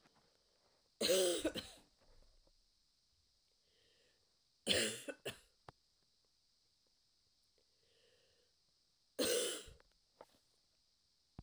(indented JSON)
{
  "three_cough_length": "11.4 s",
  "three_cough_amplitude": 3791,
  "three_cough_signal_mean_std_ratio": 0.29,
  "survey_phase": "beta (2021-08-13 to 2022-03-07)",
  "age": "18-44",
  "gender": "Female",
  "wearing_mask": "No",
  "symptom_cough_any": true,
  "symptom_runny_or_blocked_nose": true,
  "symptom_shortness_of_breath": true,
  "symptom_diarrhoea": true,
  "symptom_fatigue": true,
  "symptom_headache": true,
  "symptom_other": true,
  "smoker_status": "Never smoked",
  "respiratory_condition_asthma": false,
  "respiratory_condition_other": false,
  "recruitment_source": "Test and Trace",
  "submission_delay": "1 day",
  "covid_test_result": "Positive",
  "covid_test_method": "RT-qPCR"
}